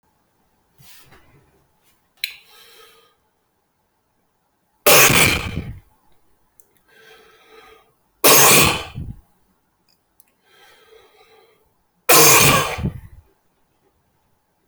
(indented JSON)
{
  "three_cough_length": "14.7 s",
  "three_cough_amplitude": 28561,
  "three_cough_signal_mean_std_ratio": 0.32,
  "survey_phase": "beta (2021-08-13 to 2022-03-07)",
  "age": "18-44",
  "gender": "Male",
  "wearing_mask": "No",
  "symptom_cough_any": true,
  "symptom_new_continuous_cough": true,
  "symptom_runny_or_blocked_nose": true,
  "symptom_shortness_of_breath": true,
  "symptom_sore_throat": true,
  "symptom_fatigue": true,
  "symptom_fever_high_temperature": true,
  "symptom_headache": true,
  "symptom_change_to_sense_of_smell_or_taste": true,
  "symptom_onset": "4 days",
  "smoker_status": "Never smoked",
  "respiratory_condition_asthma": true,
  "respiratory_condition_other": false,
  "recruitment_source": "Test and Trace",
  "submission_delay": "1 day",
  "covid_test_result": "Positive",
  "covid_test_method": "RT-qPCR"
}